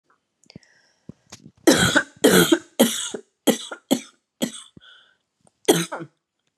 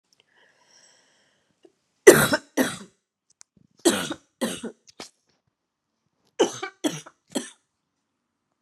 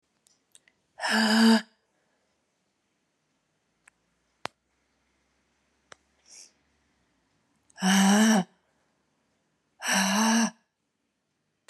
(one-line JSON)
{"cough_length": "6.6 s", "cough_amplitude": 29295, "cough_signal_mean_std_ratio": 0.35, "three_cough_length": "8.6 s", "three_cough_amplitude": 32768, "three_cough_signal_mean_std_ratio": 0.23, "exhalation_length": "11.7 s", "exhalation_amplitude": 10476, "exhalation_signal_mean_std_ratio": 0.34, "survey_phase": "beta (2021-08-13 to 2022-03-07)", "age": "45-64", "gender": "Female", "wearing_mask": "No", "symptom_cough_any": true, "symptom_runny_or_blocked_nose": true, "symptom_sore_throat": true, "symptom_fatigue": true, "symptom_headache": true, "symptom_onset": "3 days", "smoker_status": "Never smoked", "respiratory_condition_asthma": false, "respiratory_condition_other": false, "recruitment_source": "Test and Trace", "submission_delay": "1 day", "covid_test_result": "Positive", "covid_test_method": "RT-qPCR", "covid_ct_value": 19.9, "covid_ct_gene": "ORF1ab gene"}